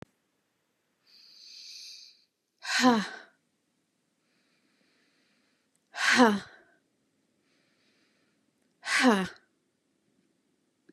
{
  "exhalation_length": "10.9 s",
  "exhalation_amplitude": 16753,
  "exhalation_signal_mean_std_ratio": 0.27,
  "survey_phase": "beta (2021-08-13 to 2022-03-07)",
  "age": "18-44",
  "gender": "Female",
  "wearing_mask": "No",
  "symptom_cough_any": true,
  "symptom_sore_throat": true,
  "symptom_fatigue": true,
  "symptom_other": true,
  "symptom_onset": "3 days",
  "smoker_status": "Never smoked",
  "respiratory_condition_asthma": false,
  "respiratory_condition_other": false,
  "recruitment_source": "REACT",
  "submission_delay": "1 day",
  "covid_test_result": "Negative",
  "covid_test_method": "RT-qPCR",
  "influenza_a_test_result": "Negative",
  "influenza_b_test_result": "Negative"
}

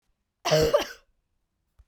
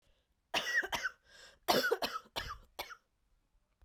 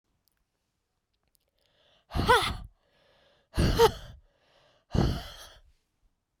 {
  "cough_length": "1.9 s",
  "cough_amplitude": 11455,
  "cough_signal_mean_std_ratio": 0.37,
  "three_cough_length": "3.8 s",
  "three_cough_amplitude": 6789,
  "three_cough_signal_mean_std_ratio": 0.43,
  "exhalation_length": "6.4 s",
  "exhalation_amplitude": 13070,
  "exhalation_signal_mean_std_ratio": 0.32,
  "survey_phase": "beta (2021-08-13 to 2022-03-07)",
  "age": "18-44",
  "gender": "Female",
  "wearing_mask": "No",
  "symptom_cough_any": true,
  "symptom_runny_or_blocked_nose": true,
  "symptom_shortness_of_breath": true,
  "symptom_fatigue": true,
  "symptom_headache": true,
  "symptom_change_to_sense_of_smell_or_taste": true,
  "symptom_onset": "4 days",
  "smoker_status": "Never smoked",
  "respiratory_condition_asthma": false,
  "respiratory_condition_other": false,
  "recruitment_source": "Test and Trace",
  "submission_delay": "1 day",
  "covid_test_result": "Positive",
  "covid_test_method": "RT-qPCR",
  "covid_ct_value": 21.4,
  "covid_ct_gene": "N gene"
}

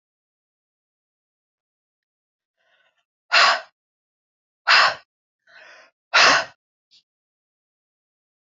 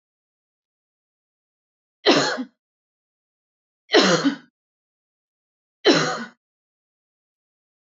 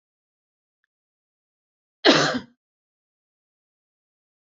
{
  "exhalation_length": "8.4 s",
  "exhalation_amplitude": 26743,
  "exhalation_signal_mean_std_ratio": 0.25,
  "three_cough_length": "7.9 s",
  "three_cough_amplitude": 26217,
  "three_cough_signal_mean_std_ratio": 0.28,
  "cough_length": "4.4 s",
  "cough_amplitude": 27382,
  "cough_signal_mean_std_ratio": 0.2,
  "survey_phase": "beta (2021-08-13 to 2022-03-07)",
  "age": "45-64",
  "gender": "Female",
  "wearing_mask": "No",
  "symptom_none": true,
  "smoker_status": "Ex-smoker",
  "respiratory_condition_asthma": false,
  "respiratory_condition_other": false,
  "recruitment_source": "REACT",
  "submission_delay": "1 day",
  "covid_test_result": "Negative",
  "covid_test_method": "RT-qPCR",
  "influenza_a_test_result": "Negative",
  "influenza_b_test_result": "Negative"
}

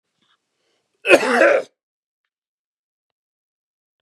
{
  "cough_length": "4.0 s",
  "cough_amplitude": 32768,
  "cough_signal_mean_std_ratio": 0.27,
  "survey_phase": "beta (2021-08-13 to 2022-03-07)",
  "age": "65+",
  "gender": "Male",
  "wearing_mask": "No",
  "symptom_none": true,
  "symptom_onset": "6 days",
  "smoker_status": "Ex-smoker",
  "respiratory_condition_asthma": false,
  "respiratory_condition_other": false,
  "recruitment_source": "REACT",
  "submission_delay": "5 days",
  "covid_test_result": "Negative",
  "covid_test_method": "RT-qPCR",
  "influenza_a_test_result": "Negative",
  "influenza_b_test_result": "Negative"
}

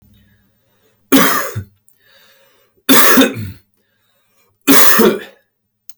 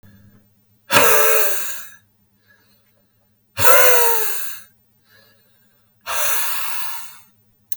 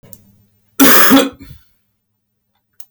{
  "three_cough_length": "6.0 s",
  "three_cough_amplitude": 32768,
  "three_cough_signal_mean_std_ratio": 0.41,
  "exhalation_length": "7.8 s",
  "exhalation_amplitude": 32768,
  "exhalation_signal_mean_std_ratio": 0.47,
  "cough_length": "2.9 s",
  "cough_amplitude": 32768,
  "cough_signal_mean_std_ratio": 0.37,
  "survey_phase": "beta (2021-08-13 to 2022-03-07)",
  "age": "18-44",
  "gender": "Male",
  "wearing_mask": "No",
  "symptom_sore_throat": true,
  "symptom_headache": true,
  "symptom_onset": "3 days",
  "smoker_status": "Ex-smoker",
  "respiratory_condition_asthma": true,
  "respiratory_condition_other": false,
  "recruitment_source": "Test and Trace",
  "submission_delay": "0 days",
  "covid_test_result": "Positive",
  "covid_test_method": "RT-qPCR",
  "covid_ct_value": 21.0,
  "covid_ct_gene": "ORF1ab gene"
}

